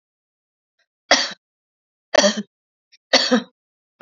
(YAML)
three_cough_length: 4.0 s
three_cough_amplitude: 32767
three_cough_signal_mean_std_ratio: 0.3
survey_phase: beta (2021-08-13 to 2022-03-07)
age: 45-64
gender: Female
wearing_mask: 'No'
symptom_runny_or_blocked_nose: true
symptom_other: true
symptom_onset: 1 day
smoker_status: Never smoked
respiratory_condition_asthma: false
respiratory_condition_other: false
recruitment_source: Test and Trace
submission_delay: 0 days
covid_test_result: Negative
covid_test_method: RT-qPCR